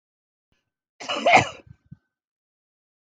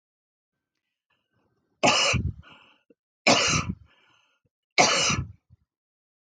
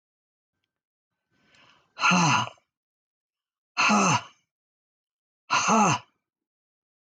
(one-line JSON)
{"cough_length": "3.1 s", "cough_amplitude": 24031, "cough_signal_mean_std_ratio": 0.25, "three_cough_length": "6.4 s", "three_cough_amplitude": 18106, "three_cough_signal_mean_std_ratio": 0.37, "exhalation_length": "7.2 s", "exhalation_amplitude": 11259, "exhalation_signal_mean_std_ratio": 0.37, "survey_phase": "alpha (2021-03-01 to 2021-08-12)", "age": "65+", "gender": "Female", "wearing_mask": "No", "symptom_none": true, "smoker_status": "Never smoked", "respiratory_condition_asthma": false, "respiratory_condition_other": false, "recruitment_source": "REACT", "submission_delay": "1 day", "covid_test_result": "Negative", "covid_test_method": "RT-qPCR"}